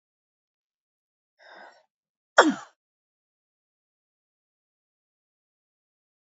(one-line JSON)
{"three_cough_length": "6.3 s", "three_cough_amplitude": 27643, "three_cough_signal_mean_std_ratio": 0.12, "survey_phase": "alpha (2021-03-01 to 2021-08-12)", "age": "65+", "gender": "Female", "wearing_mask": "No", "symptom_none": true, "smoker_status": "Ex-smoker", "respiratory_condition_asthma": false, "respiratory_condition_other": false, "recruitment_source": "REACT", "submission_delay": "1 day", "covid_test_result": "Negative", "covid_test_method": "RT-qPCR"}